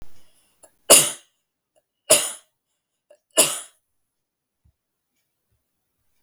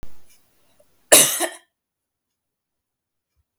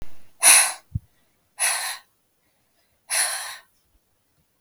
three_cough_length: 6.2 s
three_cough_amplitude: 32768
three_cough_signal_mean_std_ratio: 0.23
cough_length: 3.6 s
cough_amplitude: 32768
cough_signal_mean_std_ratio: 0.25
exhalation_length: 4.6 s
exhalation_amplitude: 32768
exhalation_signal_mean_std_ratio: 0.36
survey_phase: beta (2021-08-13 to 2022-03-07)
age: 18-44
gender: Female
wearing_mask: 'No'
symptom_none: true
smoker_status: Never smoked
respiratory_condition_asthma: false
respiratory_condition_other: false
recruitment_source: REACT
submission_delay: 3 days
covid_test_result: Negative
covid_test_method: RT-qPCR
influenza_a_test_result: Negative
influenza_b_test_result: Negative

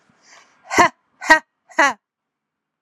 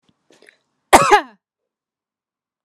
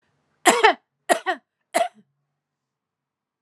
exhalation_length: 2.8 s
exhalation_amplitude: 32768
exhalation_signal_mean_std_ratio: 0.28
cough_length: 2.6 s
cough_amplitude: 32768
cough_signal_mean_std_ratio: 0.23
three_cough_length: 3.4 s
three_cough_amplitude: 32767
three_cough_signal_mean_std_ratio: 0.28
survey_phase: alpha (2021-03-01 to 2021-08-12)
age: 45-64
gender: Female
wearing_mask: 'No'
symptom_none: true
smoker_status: Never smoked
respiratory_condition_asthma: false
respiratory_condition_other: false
recruitment_source: REACT
submission_delay: 2 days
covid_test_result: Negative
covid_test_method: RT-qPCR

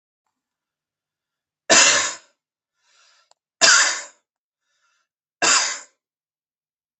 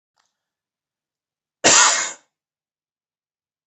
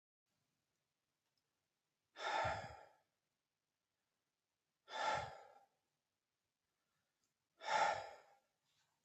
three_cough_length: 7.0 s
three_cough_amplitude: 32768
three_cough_signal_mean_std_ratio: 0.31
cough_length: 3.7 s
cough_amplitude: 32766
cough_signal_mean_std_ratio: 0.26
exhalation_length: 9.0 s
exhalation_amplitude: 1999
exhalation_signal_mean_std_ratio: 0.3
survey_phase: beta (2021-08-13 to 2022-03-07)
age: 45-64
gender: Male
wearing_mask: 'No'
symptom_none: true
smoker_status: Never smoked
respiratory_condition_asthma: false
respiratory_condition_other: false
recruitment_source: REACT
submission_delay: 2 days
covid_test_result: Negative
covid_test_method: RT-qPCR
influenza_a_test_result: Negative
influenza_b_test_result: Negative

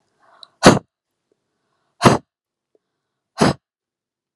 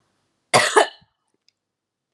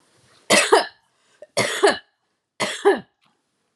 exhalation_length: 4.4 s
exhalation_amplitude: 32768
exhalation_signal_mean_std_ratio: 0.23
cough_length: 2.1 s
cough_amplitude: 31683
cough_signal_mean_std_ratio: 0.27
three_cough_length: 3.8 s
three_cough_amplitude: 30882
three_cough_signal_mean_std_ratio: 0.38
survey_phase: alpha (2021-03-01 to 2021-08-12)
age: 18-44
gender: Female
wearing_mask: 'No'
symptom_none: true
smoker_status: Never smoked
respiratory_condition_asthma: true
respiratory_condition_other: false
recruitment_source: Test and Trace
submission_delay: 0 days
covid_test_result: Negative
covid_test_method: LFT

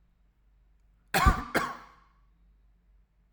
cough_length: 3.3 s
cough_amplitude: 14866
cough_signal_mean_std_ratio: 0.29
survey_phase: alpha (2021-03-01 to 2021-08-12)
age: 18-44
gender: Male
wearing_mask: 'No'
symptom_none: true
smoker_status: Ex-smoker
respiratory_condition_asthma: false
respiratory_condition_other: false
recruitment_source: REACT
submission_delay: 3 days
covid_test_result: Negative
covid_test_method: RT-qPCR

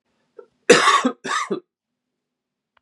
cough_length: 2.8 s
cough_amplitude: 32654
cough_signal_mean_std_ratio: 0.35
survey_phase: beta (2021-08-13 to 2022-03-07)
age: 45-64
gender: Male
wearing_mask: 'No'
symptom_cough_any: true
symptom_runny_or_blocked_nose: true
symptom_sore_throat: true
symptom_headache: true
smoker_status: Never smoked
respiratory_condition_asthma: false
respiratory_condition_other: false
recruitment_source: Test and Trace
submission_delay: 1 day
covid_test_result: Positive
covid_test_method: LFT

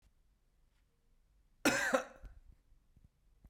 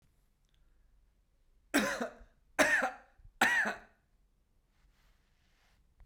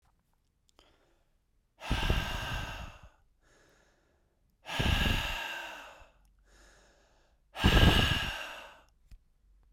cough_length: 3.5 s
cough_amplitude: 4654
cough_signal_mean_std_ratio: 0.29
three_cough_length: 6.1 s
three_cough_amplitude: 8242
three_cough_signal_mean_std_ratio: 0.34
exhalation_length: 9.7 s
exhalation_amplitude: 9516
exhalation_signal_mean_std_ratio: 0.39
survey_phase: beta (2021-08-13 to 2022-03-07)
age: 18-44
gender: Male
wearing_mask: 'No'
symptom_cough_any: true
symptom_runny_or_blocked_nose: true
symptom_headache: true
symptom_onset: 3 days
smoker_status: Never smoked
respiratory_condition_asthma: false
respiratory_condition_other: false
recruitment_source: Test and Trace
submission_delay: 2 days
covid_test_result: Positive
covid_test_method: RT-qPCR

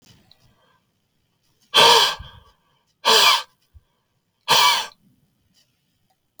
exhalation_length: 6.4 s
exhalation_amplitude: 29431
exhalation_signal_mean_std_ratio: 0.34
survey_phase: beta (2021-08-13 to 2022-03-07)
age: 45-64
gender: Male
wearing_mask: 'No'
symptom_headache: true
smoker_status: Never smoked
respiratory_condition_asthma: false
respiratory_condition_other: false
recruitment_source: REACT
submission_delay: 1 day
covid_test_result: Negative
covid_test_method: RT-qPCR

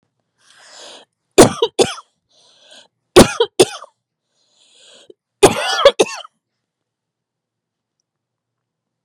three_cough_length: 9.0 s
three_cough_amplitude: 32768
three_cough_signal_mean_std_ratio: 0.25
survey_phase: beta (2021-08-13 to 2022-03-07)
age: 18-44
gender: Female
wearing_mask: 'No'
symptom_cough_any: true
symptom_runny_or_blocked_nose: true
symptom_fever_high_temperature: true
symptom_onset: 9 days
smoker_status: Never smoked
respiratory_condition_asthma: true
respiratory_condition_other: false
recruitment_source: REACT
submission_delay: 0 days
covid_test_result: Negative
covid_test_method: RT-qPCR
influenza_a_test_result: Unknown/Void
influenza_b_test_result: Unknown/Void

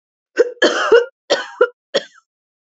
three_cough_length: 2.7 s
three_cough_amplitude: 28831
three_cough_signal_mean_std_ratio: 0.41
survey_phase: beta (2021-08-13 to 2022-03-07)
age: 45-64
gender: Female
wearing_mask: 'No'
symptom_change_to_sense_of_smell_or_taste: true
symptom_onset: 12 days
smoker_status: Never smoked
respiratory_condition_asthma: false
respiratory_condition_other: false
recruitment_source: REACT
submission_delay: 1 day
covid_test_result: Negative
covid_test_method: RT-qPCR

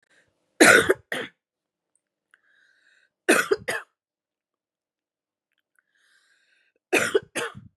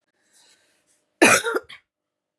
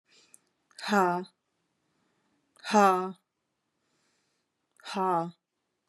three_cough_length: 7.8 s
three_cough_amplitude: 29204
three_cough_signal_mean_std_ratio: 0.26
cough_length: 2.4 s
cough_amplitude: 31663
cough_signal_mean_std_ratio: 0.27
exhalation_length: 5.9 s
exhalation_amplitude: 13434
exhalation_signal_mean_std_ratio: 0.3
survey_phase: beta (2021-08-13 to 2022-03-07)
age: 18-44
gender: Female
wearing_mask: 'No'
symptom_cough_any: true
symptom_runny_or_blocked_nose: true
symptom_shortness_of_breath: true
symptom_sore_throat: true
symptom_fatigue: true
symptom_fever_high_temperature: true
symptom_headache: true
symptom_onset: 5 days
smoker_status: Never smoked
respiratory_condition_asthma: false
respiratory_condition_other: false
recruitment_source: Test and Trace
submission_delay: 2 days
covid_test_method: RT-qPCR
covid_ct_value: 29.1
covid_ct_gene: ORF1ab gene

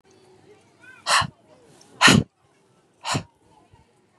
exhalation_length: 4.2 s
exhalation_amplitude: 28540
exhalation_signal_mean_std_ratio: 0.28
survey_phase: beta (2021-08-13 to 2022-03-07)
age: 18-44
gender: Female
wearing_mask: 'No'
symptom_none: true
smoker_status: Ex-smoker
respiratory_condition_asthma: false
respiratory_condition_other: false
recruitment_source: REACT
submission_delay: 1 day
covid_test_result: Negative
covid_test_method: RT-qPCR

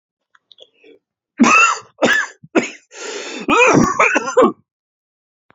cough_length: 5.5 s
cough_amplitude: 31808
cough_signal_mean_std_ratio: 0.48
survey_phase: beta (2021-08-13 to 2022-03-07)
age: 45-64
gender: Male
wearing_mask: 'No'
symptom_cough_any: true
symptom_runny_or_blocked_nose: true
symptom_fatigue: true
symptom_fever_high_temperature: true
symptom_headache: true
symptom_change_to_sense_of_smell_or_taste: true
symptom_onset: 6 days
smoker_status: Never smoked
respiratory_condition_asthma: false
respiratory_condition_other: false
recruitment_source: Test and Trace
submission_delay: 1 day
covid_test_result: Positive
covid_test_method: RT-qPCR
covid_ct_value: 15.1
covid_ct_gene: ORF1ab gene
covid_ct_mean: 15.4
covid_viral_load: 8900000 copies/ml
covid_viral_load_category: High viral load (>1M copies/ml)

